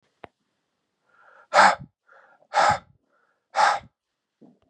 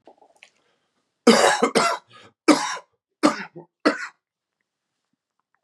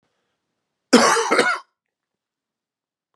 {"exhalation_length": "4.7 s", "exhalation_amplitude": 24457, "exhalation_signal_mean_std_ratio": 0.3, "three_cough_length": "5.6 s", "three_cough_amplitude": 29328, "three_cough_signal_mean_std_ratio": 0.33, "cough_length": "3.2 s", "cough_amplitude": 32701, "cough_signal_mean_std_ratio": 0.34, "survey_phase": "beta (2021-08-13 to 2022-03-07)", "age": "45-64", "gender": "Male", "wearing_mask": "No", "symptom_cough_any": true, "symptom_runny_or_blocked_nose": true, "symptom_sore_throat": true, "symptom_fatigue": true, "symptom_other": true, "symptom_onset": "3 days", "smoker_status": "Never smoked", "respiratory_condition_asthma": false, "respiratory_condition_other": false, "recruitment_source": "Test and Trace", "submission_delay": "1 day", "covid_test_result": "Positive", "covid_test_method": "RT-qPCR", "covid_ct_value": 20.7, "covid_ct_gene": "N gene"}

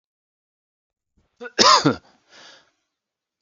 {"three_cough_length": "3.4 s", "three_cough_amplitude": 32768, "three_cough_signal_mean_std_ratio": 0.25, "survey_phase": "beta (2021-08-13 to 2022-03-07)", "age": "18-44", "gender": "Male", "wearing_mask": "No", "symptom_cough_any": true, "symptom_runny_or_blocked_nose": true, "symptom_fatigue": true, "symptom_headache": true, "symptom_change_to_sense_of_smell_or_taste": true, "smoker_status": "Ex-smoker", "respiratory_condition_asthma": false, "respiratory_condition_other": false, "recruitment_source": "Test and Trace", "submission_delay": "1 day", "covid_test_result": "Positive", "covid_test_method": "RT-qPCR"}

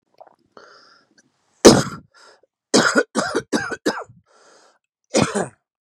{"cough_length": "5.8 s", "cough_amplitude": 32768, "cough_signal_mean_std_ratio": 0.32, "survey_phase": "beta (2021-08-13 to 2022-03-07)", "age": "45-64", "gender": "Male", "wearing_mask": "No", "symptom_cough_any": true, "symptom_new_continuous_cough": true, "symptom_shortness_of_breath": true, "symptom_sore_throat": true, "symptom_onset": "3 days", "smoker_status": "Never smoked", "respiratory_condition_asthma": false, "respiratory_condition_other": false, "recruitment_source": "Test and Trace", "submission_delay": "2 days", "covid_test_result": "Positive", "covid_test_method": "RT-qPCR", "covid_ct_value": 22.4, "covid_ct_gene": "ORF1ab gene"}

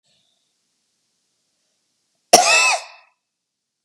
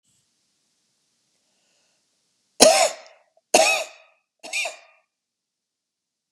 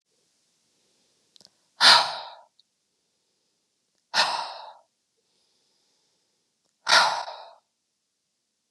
{"cough_length": "3.8 s", "cough_amplitude": 32768, "cough_signal_mean_std_ratio": 0.26, "three_cough_length": "6.3 s", "three_cough_amplitude": 32768, "three_cough_signal_mean_std_ratio": 0.26, "exhalation_length": "8.7 s", "exhalation_amplitude": 26798, "exhalation_signal_mean_std_ratio": 0.25, "survey_phase": "beta (2021-08-13 to 2022-03-07)", "age": "45-64", "gender": "Female", "wearing_mask": "No", "symptom_none": true, "smoker_status": "Never smoked", "respiratory_condition_asthma": false, "respiratory_condition_other": false, "recruitment_source": "REACT", "submission_delay": "0 days", "covid_test_result": "Negative", "covid_test_method": "RT-qPCR", "influenza_a_test_result": "Negative", "influenza_b_test_result": "Negative"}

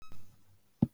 {"three_cough_length": "0.9 s", "three_cough_amplitude": 7484, "three_cough_signal_mean_std_ratio": 0.38, "survey_phase": "beta (2021-08-13 to 2022-03-07)", "age": "65+", "gender": "Female", "wearing_mask": "No", "symptom_none": true, "smoker_status": "Never smoked", "respiratory_condition_asthma": false, "respiratory_condition_other": false, "recruitment_source": "REACT", "submission_delay": "1 day", "covid_test_result": "Negative", "covid_test_method": "RT-qPCR", "influenza_a_test_result": "Negative", "influenza_b_test_result": "Negative"}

